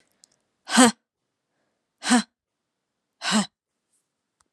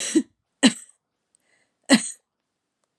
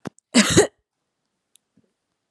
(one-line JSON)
{"exhalation_length": "4.5 s", "exhalation_amplitude": 32305, "exhalation_signal_mean_std_ratio": 0.26, "three_cough_length": "3.0 s", "three_cough_amplitude": 25371, "three_cough_signal_mean_std_ratio": 0.27, "cough_length": "2.3 s", "cough_amplitude": 29865, "cough_signal_mean_std_ratio": 0.28, "survey_phase": "alpha (2021-03-01 to 2021-08-12)", "age": "18-44", "gender": "Female", "wearing_mask": "No", "symptom_cough_any": true, "symptom_headache": true, "smoker_status": "Never smoked", "respiratory_condition_asthma": false, "respiratory_condition_other": false, "recruitment_source": "Test and Trace", "submission_delay": "2 days", "covid_test_result": "Positive", "covid_test_method": "RT-qPCR"}